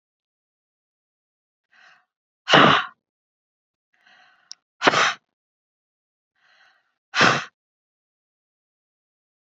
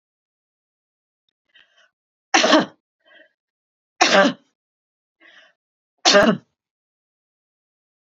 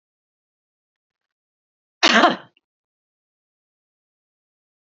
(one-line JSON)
{"exhalation_length": "9.5 s", "exhalation_amplitude": 28102, "exhalation_signal_mean_std_ratio": 0.23, "three_cough_length": "8.1 s", "three_cough_amplitude": 31434, "three_cough_signal_mean_std_ratio": 0.26, "cough_length": "4.9 s", "cough_amplitude": 31030, "cough_signal_mean_std_ratio": 0.19, "survey_phase": "beta (2021-08-13 to 2022-03-07)", "age": "65+", "gender": "Female", "wearing_mask": "No", "symptom_none": true, "smoker_status": "Ex-smoker", "respiratory_condition_asthma": false, "respiratory_condition_other": false, "recruitment_source": "REACT", "submission_delay": "2 days", "covid_test_result": "Negative", "covid_test_method": "RT-qPCR", "influenza_a_test_result": "Negative", "influenza_b_test_result": "Negative"}